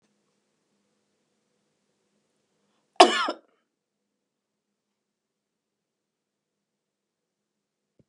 {"cough_length": "8.1 s", "cough_amplitude": 32602, "cough_signal_mean_std_ratio": 0.11, "survey_phase": "beta (2021-08-13 to 2022-03-07)", "age": "65+", "gender": "Female", "wearing_mask": "No", "symptom_none": true, "smoker_status": "Ex-smoker", "respiratory_condition_asthma": false, "respiratory_condition_other": false, "recruitment_source": "REACT", "submission_delay": "2 days", "covid_test_result": "Negative", "covid_test_method": "RT-qPCR", "influenza_a_test_result": "Negative", "influenza_b_test_result": "Negative"}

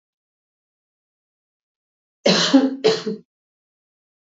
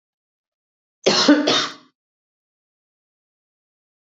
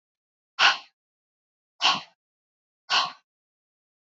{"three_cough_length": "4.4 s", "three_cough_amplitude": 26471, "three_cough_signal_mean_std_ratio": 0.31, "cough_length": "4.2 s", "cough_amplitude": 26166, "cough_signal_mean_std_ratio": 0.29, "exhalation_length": "4.0 s", "exhalation_amplitude": 18219, "exhalation_signal_mean_std_ratio": 0.27, "survey_phase": "beta (2021-08-13 to 2022-03-07)", "age": "45-64", "gender": "Female", "wearing_mask": "No", "symptom_new_continuous_cough": true, "symptom_runny_or_blocked_nose": true, "symptom_onset": "2 days", "smoker_status": "Never smoked", "respiratory_condition_asthma": false, "respiratory_condition_other": false, "recruitment_source": "Test and Trace", "submission_delay": "1 day", "covid_test_result": "Negative", "covid_test_method": "RT-qPCR"}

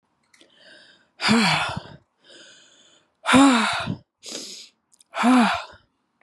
{"exhalation_length": "6.2 s", "exhalation_amplitude": 24076, "exhalation_signal_mean_std_ratio": 0.42, "survey_phase": "beta (2021-08-13 to 2022-03-07)", "age": "18-44", "gender": "Female", "wearing_mask": "No", "symptom_fatigue": true, "symptom_headache": true, "symptom_onset": "4 days", "smoker_status": "Never smoked", "respiratory_condition_asthma": false, "respiratory_condition_other": false, "recruitment_source": "Test and Trace", "submission_delay": "2 days", "covid_test_result": "Positive", "covid_test_method": "RT-qPCR", "covid_ct_value": 18.1, "covid_ct_gene": "ORF1ab gene", "covid_ct_mean": 18.5, "covid_viral_load": "830000 copies/ml", "covid_viral_load_category": "Low viral load (10K-1M copies/ml)"}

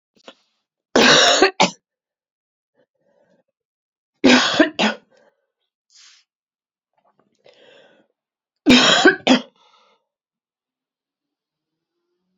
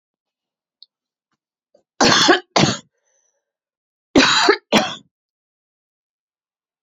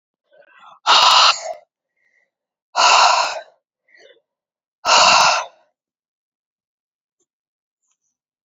{"three_cough_length": "12.4 s", "three_cough_amplitude": 31696, "three_cough_signal_mean_std_ratio": 0.3, "cough_length": "6.8 s", "cough_amplitude": 32767, "cough_signal_mean_std_ratio": 0.32, "exhalation_length": "8.4 s", "exhalation_amplitude": 32768, "exhalation_signal_mean_std_ratio": 0.37, "survey_phase": "beta (2021-08-13 to 2022-03-07)", "age": "45-64", "gender": "Female", "wearing_mask": "No", "symptom_runny_or_blocked_nose": true, "symptom_fatigue": true, "symptom_headache": true, "symptom_onset": "8 days", "smoker_status": "Never smoked", "respiratory_condition_asthma": false, "respiratory_condition_other": false, "recruitment_source": "Test and Trace", "submission_delay": "2 days", "covid_test_result": "Positive", "covid_test_method": "RT-qPCR", "covid_ct_value": 15.7, "covid_ct_gene": "ORF1ab gene", "covid_ct_mean": 16.1, "covid_viral_load": "5200000 copies/ml", "covid_viral_load_category": "High viral load (>1M copies/ml)"}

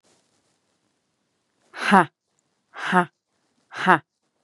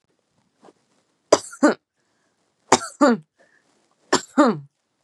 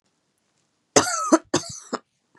{"exhalation_length": "4.4 s", "exhalation_amplitude": 32281, "exhalation_signal_mean_std_ratio": 0.25, "three_cough_length": "5.0 s", "three_cough_amplitude": 32768, "three_cough_signal_mean_std_ratio": 0.28, "cough_length": "2.4 s", "cough_amplitude": 31773, "cough_signal_mean_std_ratio": 0.32, "survey_phase": "beta (2021-08-13 to 2022-03-07)", "age": "18-44", "gender": "Female", "wearing_mask": "No", "symptom_other": true, "smoker_status": "Never smoked", "respiratory_condition_asthma": false, "respiratory_condition_other": false, "recruitment_source": "REACT", "submission_delay": "4 days", "covid_test_result": "Negative", "covid_test_method": "RT-qPCR", "influenza_a_test_result": "Negative", "influenza_b_test_result": "Negative"}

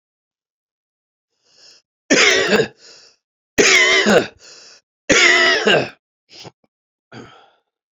{"three_cough_length": "7.9 s", "three_cough_amplitude": 31967, "three_cough_signal_mean_std_ratio": 0.43, "survey_phase": "beta (2021-08-13 to 2022-03-07)", "age": "45-64", "gender": "Male", "wearing_mask": "No", "symptom_cough_any": true, "symptom_runny_or_blocked_nose": true, "symptom_sore_throat": true, "symptom_abdominal_pain": true, "symptom_fatigue": true, "symptom_fever_high_temperature": true, "symptom_headache": true, "symptom_change_to_sense_of_smell_or_taste": true, "symptom_loss_of_taste": true, "symptom_onset": "2 days", "smoker_status": "Never smoked", "respiratory_condition_asthma": false, "respiratory_condition_other": false, "recruitment_source": "Test and Trace", "submission_delay": "1 day", "covid_test_result": "Positive", "covid_test_method": "RT-qPCR", "covid_ct_value": 23.7, "covid_ct_gene": "ORF1ab gene", "covid_ct_mean": 24.4, "covid_viral_load": "10000 copies/ml", "covid_viral_load_category": "Minimal viral load (< 10K copies/ml)"}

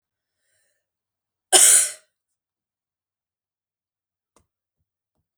{"cough_length": "5.4 s", "cough_amplitude": 32768, "cough_signal_mean_std_ratio": 0.2, "survey_phase": "beta (2021-08-13 to 2022-03-07)", "age": "45-64", "gender": "Female", "wearing_mask": "No", "symptom_none": true, "symptom_onset": "7 days", "smoker_status": "Never smoked", "respiratory_condition_asthma": false, "respiratory_condition_other": false, "recruitment_source": "REACT", "submission_delay": "1 day", "covid_test_result": "Negative", "covid_test_method": "RT-qPCR", "influenza_a_test_result": "Negative", "influenza_b_test_result": "Negative"}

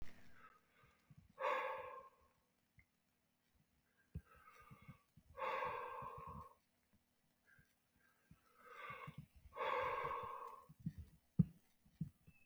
{"exhalation_length": "12.5 s", "exhalation_amplitude": 3050, "exhalation_signal_mean_std_ratio": 0.41, "survey_phase": "beta (2021-08-13 to 2022-03-07)", "age": "45-64", "gender": "Male", "wearing_mask": "No", "symptom_cough_any": true, "symptom_runny_or_blocked_nose": true, "symptom_headache": true, "symptom_change_to_sense_of_smell_or_taste": true, "symptom_onset": "3 days", "smoker_status": "Current smoker (e-cigarettes or vapes only)", "respiratory_condition_asthma": false, "respiratory_condition_other": false, "recruitment_source": "Test and Trace", "submission_delay": "1 day", "covid_test_result": "Positive", "covid_test_method": "RT-qPCR", "covid_ct_value": 18.0, "covid_ct_gene": "N gene", "covid_ct_mean": 18.1, "covid_viral_load": "1200000 copies/ml", "covid_viral_load_category": "High viral load (>1M copies/ml)"}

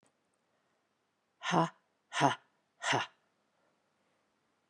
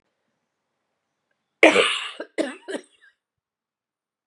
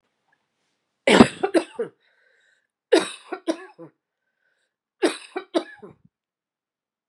{"exhalation_length": "4.7 s", "exhalation_amplitude": 8559, "exhalation_signal_mean_std_ratio": 0.28, "cough_length": "4.3 s", "cough_amplitude": 32767, "cough_signal_mean_std_ratio": 0.25, "three_cough_length": "7.1 s", "three_cough_amplitude": 32768, "three_cough_signal_mean_std_ratio": 0.25, "survey_phase": "beta (2021-08-13 to 2022-03-07)", "age": "45-64", "gender": "Female", "wearing_mask": "No", "symptom_cough_any": true, "symptom_runny_or_blocked_nose": true, "symptom_fever_high_temperature": true, "symptom_loss_of_taste": true, "symptom_other": true, "smoker_status": "Never smoked", "respiratory_condition_asthma": false, "respiratory_condition_other": false, "recruitment_source": "Test and Trace", "submission_delay": "1 day", "covid_test_result": "Positive", "covid_test_method": "LFT"}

